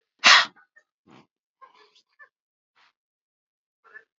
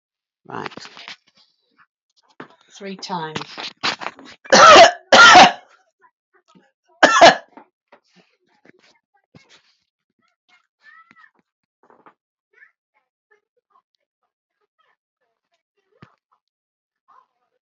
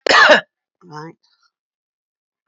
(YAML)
exhalation_length: 4.2 s
exhalation_amplitude: 28508
exhalation_signal_mean_std_ratio: 0.18
three_cough_length: 17.7 s
three_cough_amplitude: 30719
three_cough_signal_mean_std_ratio: 0.23
cough_length: 2.5 s
cough_amplitude: 31699
cough_signal_mean_std_ratio: 0.31
survey_phase: beta (2021-08-13 to 2022-03-07)
age: 45-64
gender: Male
wearing_mask: 'No'
symptom_cough_any: true
symptom_runny_or_blocked_nose: true
symptom_fever_high_temperature: true
smoker_status: Never smoked
respiratory_condition_asthma: false
respiratory_condition_other: false
recruitment_source: Test and Trace
submission_delay: 2 days
covid_test_result: Positive
covid_test_method: RT-qPCR